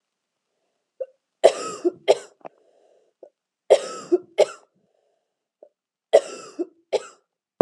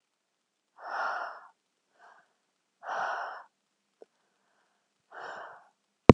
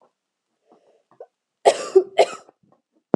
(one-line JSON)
{"three_cough_length": "7.6 s", "three_cough_amplitude": 32332, "three_cough_signal_mean_std_ratio": 0.24, "exhalation_length": "6.1 s", "exhalation_amplitude": 32768, "exhalation_signal_mean_std_ratio": 0.15, "cough_length": "3.2 s", "cough_amplitude": 30849, "cough_signal_mean_std_ratio": 0.24, "survey_phase": "beta (2021-08-13 to 2022-03-07)", "age": "18-44", "gender": "Female", "wearing_mask": "No", "symptom_none": true, "smoker_status": "Never smoked", "respiratory_condition_asthma": false, "respiratory_condition_other": false, "recruitment_source": "REACT", "submission_delay": "1 day", "covid_test_result": "Negative", "covid_test_method": "RT-qPCR"}